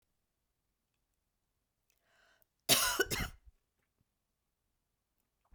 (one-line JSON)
{"cough_length": "5.5 s", "cough_amplitude": 7933, "cough_signal_mean_std_ratio": 0.23, "survey_phase": "beta (2021-08-13 to 2022-03-07)", "age": "65+", "gender": "Female", "wearing_mask": "No", "symptom_runny_or_blocked_nose": true, "symptom_fatigue": true, "symptom_headache": true, "symptom_change_to_sense_of_smell_or_taste": true, "symptom_loss_of_taste": true, "symptom_onset": "4 days", "smoker_status": "Never smoked", "respiratory_condition_asthma": false, "respiratory_condition_other": false, "recruitment_source": "Test and Trace", "submission_delay": "2 days", "covid_test_result": "Positive", "covid_test_method": "ePCR"}